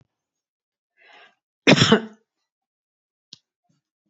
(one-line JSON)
{"cough_length": "4.1 s", "cough_amplitude": 28776, "cough_signal_mean_std_ratio": 0.21, "survey_phase": "beta (2021-08-13 to 2022-03-07)", "age": "65+", "gender": "Female", "wearing_mask": "No", "symptom_none": true, "smoker_status": "Ex-smoker", "respiratory_condition_asthma": true, "respiratory_condition_other": false, "recruitment_source": "REACT", "submission_delay": "3 days", "covid_test_result": "Negative", "covid_test_method": "RT-qPCR", "influenza_a_test_result": "Negative", "influenza_b_test_result": "Negative"}